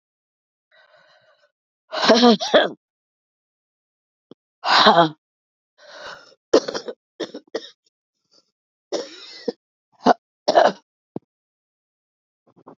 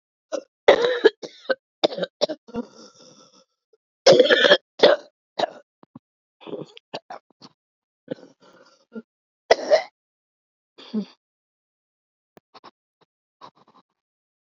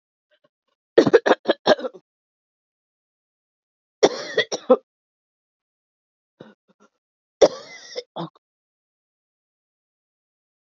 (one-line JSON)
{"exhalation_length": "12.8 s", "exhalation_amplitude": 32299, "exhalation_signal_mean_std_ratio": 0.28, "cough_length": "14.4 s", "cough_amplitude": 32767, "cough_signal_mean_std_ratio": 0.26, "three_cough_length": "10.8 s", "three_cough_amplitude": 31198, "three_cough_signal_mean_std_ratio": 0.21, "survey_phase": "beta (2021-08-13 to 2022-03-07)", "age": "45-64", "gender": "Female", "wearing_mask": "Yes", "symptom_cough_any": true, "symptom_runny_or_blocked_nose": true, "symptom_shortness_of_breath": true, "symptom_sore_throat": true, "symptom_fatigue": true, "symptom_fever_high_temperature": true, "symptom_headache": true, "symptom_change_to_sense_of_smell_or_taste": true, "symptom_loss_of_taste": true, "symptom_other": true, "symptom_onset": "4 days", "smoker_status": "Ex-smoker", "respiratory_condition_asthma": false, "respiratory_condition_other": false, "recruitment_source": "Test and Trace", "submission_delay": "2 days", "covid_test_result": "Positive", "covid_test_method": "RT-qPCR", "covid_ct_value": 13.9, "covid_ct_gene": "ORF1ab gene", "covid_ct_mean": 14.1, "covid_viral_load": "24000000 copies/ml", "covid_viral_load_category": "High viral load (>1M copies/ml)"}